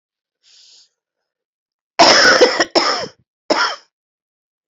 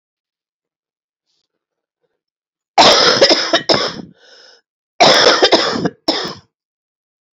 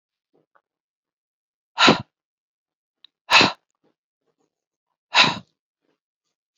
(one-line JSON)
{"cough_length": "4.7 s", "cough_amplitude": 32726, "cough_signal_mean_std_ratio": 0.39, "three_cough_length": "7.3 s", "three_cough_amplitude": 31978, "three_cough_signal_mean_std_ratio": 0.42, "exhalation_length": "6.6 s", "exhalation_amplitude": 29602, "exhalation_signal_mean_std_ratio": 0.23, "survey_phase": "beta (2021-08-13 to 2022-03-07)", "age": "45-64", "gender": "Female", "wearing_mask": "No", "symptom_cough_any": true, "symptom_shortness_of_breath": true, "symptom_sore_throat": true, "symptom_abdominal_pain": true, "symptom_fatigue": true, "symptom_fever_high_temperature": true, "symptom_headache": true, "symptom_change_to_sense_of_smell_or_taste": true, "symptom_loss_of_taste": true, "symptom_onset": "2 days", "smoker_status": "Never smoked", "respiratory_condition_asthma": false, "respiratory_condition_other": false, "recruitment_source": "Test and Trace", "submission_delay": "1 day", "covid_test_method": "PCR", "covid_ct_value": 28.4, "covid_ct_gene": "ORF1ab gene"}